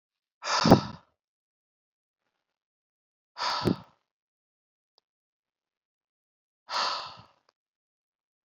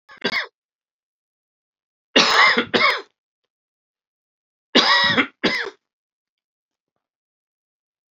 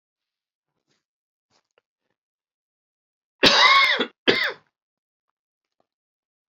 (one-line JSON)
{"exhalation_length": "8.4 s", "exhalation_amplitude": 25737, "exhalation_signal_mean_std_ratio": 0.23, "three_cough_length": "8.1 s", "three_cough_amplitude": 32768, "three_cough_signal_mean_std_ratio": 0.35, "cough_length": "6.5 s", "cough_amplitude": 32768, "cough_signal_mean_std_ratio": 0.28, "survey_phase": "alpha (2021-03-01 to 2021-08-12)", "age": "45-64", "gender": "Male", "wearing_mask": "No", "symptom_cough_any": true, "symptom_diarrhoea": true, "symptom_headache": true, "symptom_change_to_sense_of_smell_or_taste": true, "symptom_onset": "4 days", "smoker_status": "Never smoked", "respiratory_condition_asthma": false, "respiratory_condition_other": false, "recruitment_source": "Test and Trace", "submission_delay": "2 days", "covid_test_result": "Positive", "covid_test_method": "RT-qPCR", "covid_ct_value": 27.4, "covid_ct_gene": "ORF1ab gene"}